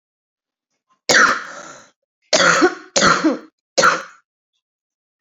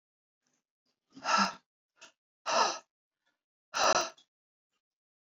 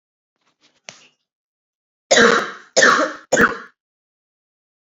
{
  "cough_length": "5.2 s",
  "cough_amplitude": 30168,
  "cough_signal_mean_std_ratio": 0.42,
  "exhalation_length": "5.3 s",
  "exhalation_amplitude": 8106,
  "exhalation_signal_mean_std_ratio": 0.32,
  "three_cough_length": "4.9 s",
  "three_cough_amplitude": 30982,
  "three_cough_signal_mean_std_ratio": 0.35,
  "survey_phase": "beta (2021-08-13 to 2022-03-07)",
  "age": "18-44",
  "gender": "Female",
  "wearing_mask": "No",
  "symptom_cough_any": true,
  "symptom_runny_or_blocked_nose": true,
  "symptom_onset": "3 days",
  "smoker_status": "Current smoker (11 or more cigarettes per day)",
  "respiratory_condition_asthma": false,
  "respiratory_condition_other": false,
  "recruitment_source": "Test and Trace",
  "submission_delay": "1 day",
  "covid_test_result": "Positive",
  "covid_test_method": "RT-qPCR",
  "covid_ct_value": 18.4,
  "covid_ct_gene": "ORF1ab gene",
  "covid_ct_mean": 19.5,
  "covid_viral_load": "400000 copies/ml",
  "covid_viral_load_category": "Low viral load (10K-1M copies/ml)"
}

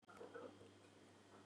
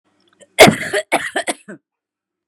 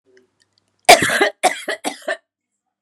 {
  "exhalation_length": "1.5 s",
  "exhalation_amplitude": 215,
  "exhalation_signal_mean_std_ratio": 0.85,
  "cough_length": "2.5 s",
  "cough_amplitude": 32768,
  "cough_signal_mean_std_ratio": 0.32,
  "three_cough_length": "2.8 s",
  "three_cough_amplitude": 32768,
  "three_cough_signal_mean_std_ratio": 0.33,
  "survey_phase": "beta (2021-08-13 to 2022-03-07)",
  "age": "18-44",
  "gender": "Female",
  "wearing_mask": "No",
  "symptom_none": true,
  "smoker_status": "Ex-smoker",
  "respiratory_condition_asthma": false,
  "respiratory_condition_other": false,
  "recruitment_source": "REACT",
  "submission_delay": "1 day",
  "covid_test_result": "Negative",
  "covid_test_method": "RT-qPCR",
  "influenza_a_test_result": "Negative",
  "influenza_b_test_result": "Negative"
}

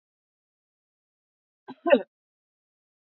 {
  "cough_length": "3.2 s",
  "cough_amplitude": 19531,
  "cough_signal_mean_std_ratio": 0.15,
  "survey_phase": "beta (2021-08-13 to 2022-03-07)",
  "age": "45-64",
  "gender": "Female",
  "wearing_mask": "No",
  "symptom_none": true,
  "smoker_status": "Ex-smoker",
  "respiratory_condition_asthma": false,
  "respiratory_condition_other": false,
  "recruitment_source": "REACT",
  "submission_delay": "1 day",
  "covid_test_result": "Negative",
  "covid_test_method": "RT-qPCR",
  "influenza_a_test_result": "Negative",
  "influenza_b_test_result": "Negative"
}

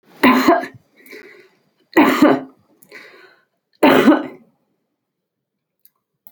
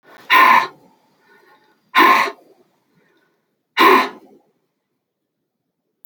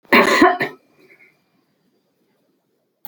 {
  "three_cough_length": "6.3 s",
  "three_cough_amplitude": 29379,
  "three_cough_signal_mean_std_ratio": 0.37,
  "exhalation_length": "6.1 s",
  "exhalation_amplitude": 29234,
  "exhalation_signal_mean_std_ratio": 0.34,
  "cough_length": "3.1 s",
  "cough_amplitude": 29131,
  "cough_signal_mean_std_ratio": 0.32,
  "survey_phase": "alpha (2021-03-01 to 2021-08-12)",
  "age": "65+",
  "gender": "Female",
  "wearing_mask": "No",
  "symptom_none": true,
  "smoker_status": "Ex-smoker",
  "respiratory_condition_asthma": false,
  "respiratory_condition_other": false,
  "recruitment_source": "REACT",
  "submission_delay": "1 day",
  "covid_test_result": "Negative",
  "covid_test_method": "RT-qPCR"
}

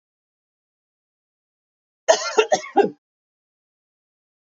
{
  "cough_length": "4.5 s",
  "cough_amplitude": 27498,
  "cough_signal_mean_std_ratio": 0.24,
  "survey_phase": "beta (2021-08-13 to 2022-03-07)",
  "age": "45-64",
  "gender": "Female",
  "wearing_mask": "No",
  "symptom_runny_or_blocked_nose": true,
  "symptom_onset": "3 days",
  "smoker_status": "Never smoked",
  "respiratory_condition_asthma": false,
  "respiratory_condition_other": false,
  "recruitment_source": "Test and Trace",
  "submission_delay": "1 day",
  "covid_test_result": "Positive",
  "covid_test_method": "RT-qPCR",
  "covid_ct_value": 18.6,
  "covid_ct_gene": "ORF1ab gene",
  "covid_ct_mean": 18.6,
  "covid_viral_load": "770000 copies/ml",
  "covid_viral_load_category": "Low viral load (10K-1M copies/ml)"
}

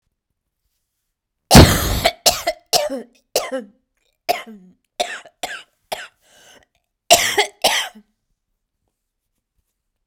{
  "three_cough_length": "10.1 s",
  "three_cough_amplitude": 32768,
  "three_cough_signal_mean_std_ratio": 0.29,
  "survey_phase": "beta (2021-08-13 to 2022-03-07)",
  "age": "18-44",
  "gender": "Female",
  "wearing_mask": "No",
  "symptom_cough_any": true,
  "symptom_runny_or_blocked_nose": true,
  "symptom_fatigue": true,
  "symptom_onset": "3 days",
  "smoker_status": "Never smoked",
  "respiratory_condition_asthma": false,
  "respiratory_condition_other": false,
  "recruitment_source": "Test and Trace",
  "submission_delay": "1 day",
  "covid_test_result": "Negative",
  "covid_test_method": "ePCR"
}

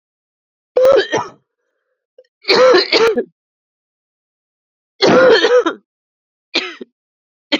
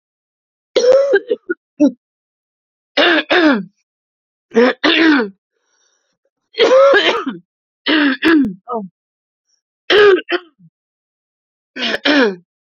{
  "three_cough_length": "7.6 s",
  "three_cough_amplitude": 32768,
  "three_cough_signal_mean_std_ratio": 0.43,
  "cough_length": "12.6 s",
  "cough_amplitude": 32767,
  "cough_signal_mean_std_ratio": 0.48,
  "survey_phase": "beta (2021-08-13 to 2022-03-07)",
  "age": "18-44",
  "gender": "Female",
  "wearing_mask": "No",
  "symptom_cough_any": true,
  "symptom_new_continuous_cough": true,
  "symptom_runny_or_blocked_nose": true,
  "symptom_sore_throat": true,
  "symptom_abdominal_pain": true,
  "symptom_fatigue": true,
  "symptom_fever_high_temperature": true,
  "symptom_headache": true,
  "symptom_change_to_sense_of_smell_or_taste": true,
  "symptom_loss_of_taste": true,
  "symptom_onset": "1 day",
  "smoker_status": "Never smoked",
  "respiratory_condition_asthma": false,
  "respiratory_condition_other": false,
  "recruitment_source": "Test and Trace",
  "submission_delay": "1 day",
  "covid_test_result": "Positive",
  "covid_test_method": "RT-qPCR",
  "covid_ct_value": 17.1,
  "covid_ct_gene": "ORF1ab gene",
  "covid_ct_mean": 17.6,
  "covid_viral_load": "1700000 copies/ml",
  "covid_viral_load_category": "High viral load (>1M copies/ml)"
}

